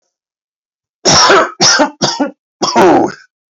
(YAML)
cough_length: 3.5 s
cough_amplitude: 32768
cough_signal_mean_std_ratio: 0.58
survey_phase: alpha (2021-03-01 to 2021-08-12)
age: 45-64
gender: Male
wearing_mask: 'No'
symptom_cough_any: true
symptom_onset: 2 days
smoker_status: Never smoked
respiratory_condition_asthma: false
respiratory_condition_other: false
recruitment_source: Test and Trace
submission_delay: 2 days
covid_test_result: Positive
covid_test_method: RT-qPCR
covid_ct_value: 16.3
covid_ct_gene: ORF1ab gene
covid_ct_mean: 16.8
covid_viral_load: 3000000 copies/ml
covid_viral_load_category: High viral load (>1M copies/ml)